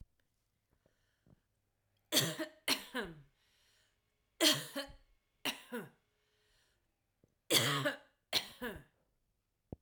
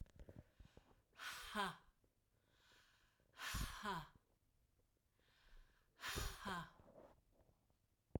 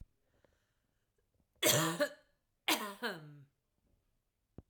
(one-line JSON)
{"three_cough_length": "9.8 s", "three_cough_amplitude": 6373, "three_cough_signal_mean_std_ratio": 0.32, "exhalation_length": "8.2 s", "exhalation_amplitude": 1213, "exhalation_signal_mean_std_ratio": 0.44, "cough_length": "4.7 s", "cough_amplitude": 5549, "cough_signal_mean_std_ratio": 0.33, "survey_phase": "alpha (2021-03-01 to 2021-08-12)", "age": "45-64", "gender": "Female", "wearing_mask": "No", "symptom_cough_any": true, "smoker_status": "Ex-smoker", "respiratory_condition_asthma": true, "respiratory_condition_other": false, "recruitment_source": "REACT", "submission_delay": "1 day", "covid_test_result": "Negative", "covid_test_method": "RT-qPCR"}